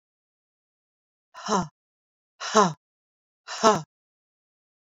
{"exhalation_length": "4.9 s", "exhalation_amplitude": 21351, "exhalation_signal_mean_std_ratio": 0.26, "survey_phase": "beta (2021-08-13 to 2022-03-07)", "age": "45-64", "gender": "Female", "wearing_mask": "No", "symptom_new_continuous_cough": true, "symptom_runny_or_blocked_nose": true, "symptom_shortness_of_breath": true, "symptom_fatigue": true, "symptom_headache": true, "symptom_change_to_sense_of_smell_or_taste": true, "symptom_other": true, "smoker_status": "Ex-smoker", "respiratory_condition_asthma": false, "respiratory_condition_other": false, "recruitment_source": "Test and Trace", "submission_delay": "31 days", "covid_test_result": "Negative", "covid_test_method": "RT-qPCR"}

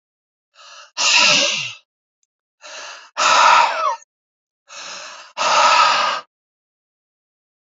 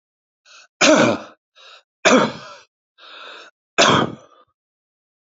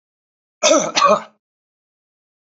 {"exhalation_length": "7.7 s", "exhalation_amplitude": 28474, "exhalation_signal_mean_std_ratio": 0.47, "three_cough_length": "5.4 s", "three_cough_amplitude": 32651, "three_cough_signal_mean_std_ratio": 0.35, "cough_length": "2.5 s", "cough_amplitude": 28394, "cough_signal_mean_std_ratio": 0.36, "survey_phase": "alpha (2021-03-01 to 2021-08-12)", "age": "45-64", "gender": "Male", "wearing_mask": "No", "symptom_none": true, "smoker_status": "Current smoker (1 to 10 cigarettes per day)", "respiratory_condition_asthma": false, "respiratory_condition_other": false, "recruitment_source": "Test and Trace", "submission_delay": "2 days", "covid_test_result": "Positive", "covid_test_method": "RT-qPCR", "covid_ct_value": 21.0, "covid_ct_gene": "ORF1ab gene", "covid_ct_mean": 21.6, "covid_viral_load": "80000 copies/ml", "covid_viral_load_category": "Low viral load (10K-1M copies/ml)"}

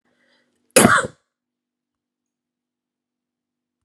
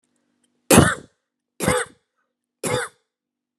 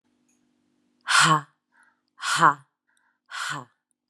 {"cough_length": "3.8 s", "cough_amplitude": 32768, "cough_signal_mean_std_ratio": 0.2, "three_cough_length": "3.6 s", "three_cough_amplitude": 32768, "three_cough_signal_mean_std_ratio": 0.3, "exhalation_length": "4.1 s", "exhalation_amplitude": 20801, "exhalation_signal_mean_std_ratio": 0.32, "survey_phase": "alpha (2021-03-01 to 2021-08-12)", "age": "18-44", "gender": "Female", "wearing_mask": "No", "symptom_none": true, "smoker_status": "Ex-smoker", "respiratory_condition_asthma": false, "respiratory_condition_other": false, "recruitment_source": "REACT", "submission_delay": "3 days", "covid_test_result": "Negative", "covid_test_method": "RT-qPCR"}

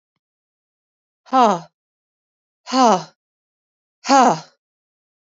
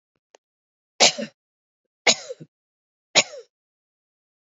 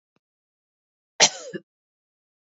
{"exhalation_length": "5.2 s", "exhalation_amplitude": 27320, "exhalation_signal_mean_std_ratio": 0.3, "three_cough_length": "4.5 s", "three_cough_amplitude": 32768, "three_cough_signal_mean_std_ratio": 0.21, "cough_length": "2.5 s", "cough_amplitude": 28690, "cough_signal_mean_std_ratio": 0.17, "survey_phase": "beta (2021-08-13 to 2022-03-07)", "age": "45-64", "gender": "Female", "wearing_mask": "No", "symptom_runny_or_blocked_nose": true, "symptom_headache": true, "symptom_onset": "3 days", "smoker_status": "Never smoked", "respiratory_condition_asthma": false, "respiratory_condition_other": false, "recruitment_source": "Test and Trace", "submission_delay": "2 days", "covid_test_result": "Positive", "covid_test_method": "RT-qPCR", "covid_ct_value": 10.7, "covid_ct_gene": "ORF1ab gene"}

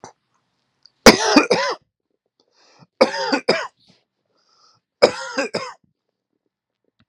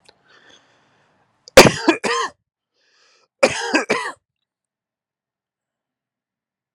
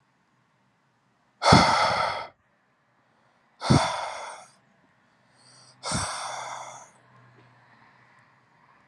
{"three_cough_length": "7.1 s", "three_cough_amplitude": 32768, "three_cough_signal_mean_std_ratio": 0.29, "cough_length": "6.7 s", "cough_amplitude": 32768, "cough_signal_mean_std_ratio": 0.24, "exhalation_length": "8.9 s", "exhalation_amplitude": 26242, "exhalation_signal_mean_std_ratio": 0.33, "survey_phase": "alpha (2021-03-01 to 2021-08-12)", "age": "18-44", "gender": "Male", "wearing_mask": "No", "symptom_change_to_sense_of_smell_or_taste": true, "symptom_onset": "4 days", "smoker_status": "Ex-smoker", "respiratory_condition_asthma": false, "respiratory_condition_other": false, "recruitment_source": "Test and Trace", "submission_delay": "2 days", "covid_test_result": "Positive", "covid_test_method": "RT-qPCR", "covid_ct_value": 17.8, "covid_ct_gene": "ORF1ab gene", "covid_ct_mean": 17.9, "covid_viral_load": "1400000 copies/ml", "covid_viral_load_category": "High viral load (>1M copies/ml)"}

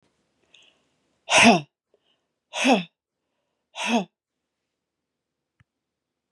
{"exhalation_length": "6.3 s", "exhalation_amplitude": 26356, "exhalation_signal_mean_std_ratio": 0.26, "survey_phase": "beta (2021-08-13 to 2022-03-07)", "age": "65+", "gender": "Female", "wearing_mask": "No", "symptom_none": true, "smoker_status": "Ex-smoker", "respiratory_condition_asthma": false, "respiratory_condition_other": false, "recruitment_source": "REACT", "submission_delay": "0 days", "covid_test_result": "Negative", "covid_test_method": "RT-qPCR", "covid_ct_value": 38.0, "covid_ct_gene": "N gene", "influenza_a_test_result": "Negative", "influenza_b_test_result": "Negative"}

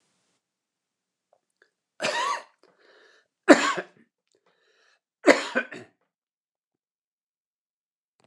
{"three_cough_length": "8.3 s", "three_cough_amplitude": 29204, "three_cough_signal_mean_std_ratio": 0.21, "survey_phase": "beta (2021-08-13 to 2022-03-07)", "age": "45-64", "gender": "Male", "wearing_mask": "No", "symptom_sore_throat": true, "symptom_fatigue": true, "symptom_onset": "3 days", "smoker_status": "Ex-smoker", "respiratory_condition_asthma": false, "respiratory_condition_other": false, "recruitment_source": "Test and Trace", "submission_delay": "2 days", "covid_test_result": "Positive", "covid_test_method": "RT-qPCR"}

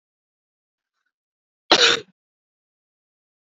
{"cough_length": "3.6 s", "cough_amplitude": 32541, "cough_signal_mean_std_ratio": 0.2, "survey_phase": "beta (2021-08-13 to 2022-03-07)", "age": "18-44", "gender": "Female", "wearing_mask": "No", "symptom_cough_any": true, "symptom_new_continuous_cough": true, "symptom_runny_or_blocked_nose": true, "symptom_headache": true, "symptom_change_to_sense_of_smell_or_taste": true, "symptom_loss_of_taste": true, "symptom_onset": "3 days", "smoker_status": "Ex-smoker", "respiratory_condition_asthma": false, "respiratory_condition_other": false, "recruitment_source": "Test and Trace", "submission_delay": "2 days", "covid_test_result": "Positive", "covid_test_method": "ePCR"}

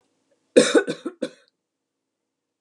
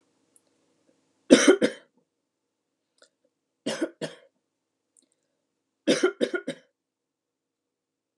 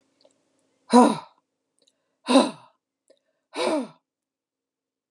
{"cough_length": "2.6 s", "cough_amplitude": 30496, "cough_signal_mean_std_ratio": 0.26, "three_cough_length": "8.2 s", "three_cough_amplitude": 32581, "three_cough_signal_mean_std_ratio": 0.22, "exhalation_length": "5.1 s", "exhalation_amplitude": 23730, "exhalation_signal_mean_std_ratio": 0.27, "survey_phase": "alpha (2021-03-01 to 2021-08-12)", "age": "65+", "gender": "Female", "wearing_mask": "No", "symptom_none": true, "smoker_status": "Never smoked", "respiratory_condition_asthma": false, "respiratory_condition_other": false, "recruitment_source": "REACT", "submission_delay": "2 days", "covid_test_result": "Negative", "covid_test_method": "RT-qPCR"}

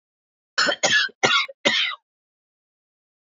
{"cough_length": "3.2 s", "cough_amplitude": 25963, "cough_signal_mean_std_ratio": 0.44, "survey_phase": "beta (2021-08-13 to 2022-03-07)", "age": "45-64", "gender": "Female", "wearing_mask": "No", "symptom_none": true, "smoker_status": "Ex-smoker", "respiratory_condition_asthma": true, "respiratory_condition_other": true, "recruitment_source": "Test and Trace", "submission_delay": "1 day", "covid_test_result": "Negative", "covid_test_method": "RT-qPCR"}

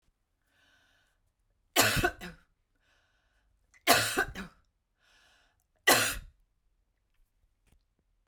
{"three_cough_length": "8.3 s", "three_cough_amplitude": 15813, "three_cough_signal_mean_std_ratio": 0.28, "survey_phase": "beta (2021-08-13 to 2022-03-07)", "age": "45-64", "gender": "Female", "wearing_mask": "No", "symptom_cough_any": true, "symptom_runny_or_blocked_nose": true, "symptom_fatigue": true, "symptom_change_to_sense_of_smell_or_taste": true, "symptom_other": true, "symptom_onset": "2 days", "smoker_status": "Never smoked", "respiratory_condition_asthma": false, "respiratory_condition_other": false, "recruitment_source": "Test and Trace", "submission_delay": "1 day", "covid_test_result": "Positive", "covid_test_method": "RT-qPCR", "covid_ct_value": 30.7, "covid_ct_gene": "N gene"}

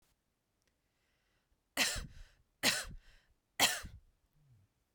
{"three_cough_length": "4.9 s", "three_cough_amplitude": 6490, "three_cough_signal_mean_std_ratio": 0.3, "survey_phase": "beta (2021-08-13 to 2022-03-07)", "age": "18-44", "gender": "Female", "wearing_mask": "No", "symptom_runny_or_blocked_nose": true, "smoker_status": "Ex-smoker", "respiratory_condition_asthma": false, "respiratory_condition_other": false, "recruitment_source": "REACT", "submission_delay": "1 day", "covid_test_result": "Negative", "covid_test_method": "RT-qPCR", "influenza_a_test_result": "Negative", "influenza_b_test_result": "Negative"}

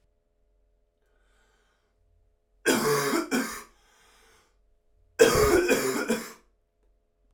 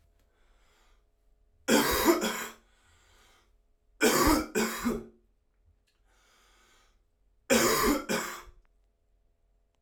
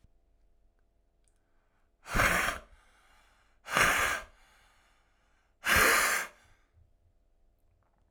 {"cough_length": "7.3 s", "cough_amplitude": 17302, "cough_signal_mean_std_ratio": 0.4, "three_cough_length": "9.8 s", "three_cough_amplitude": 10467, "three_cough_signal_mean_std_ratio": 0.4, "exhalation_length": "8.1 s", "exhalation_amplitude": 15923, "exhalation_signal_mean_std_ratio": 0.36, "survey_phase": "alpha (2021-03-01 to 2021-08-12)", "age": "18-44", "gender": "Male", "wearing_mask": "No", "symptom_cough_any": true, "symptom_fatigue": true, "smoker_status": "Current smoker (1 to 10 cigarettes per day)", "respiratory_condition_asthma": false, "respiratory_condition_other": false, "recruitment_source": "Test and Trace", "submission_delay": "1 day", "covid_test_result": "Positive", "covid_test_method": "RT-qPCR", "covid_ct_value": 18.4, "covid_ct_gene": "ORF1ab gene", "covid_ct_mean": 19.8, "covid_viral_load": "310000 copies/ml", "covid_viral_load_category": "Low viral load (10K-1M copies/ml)"}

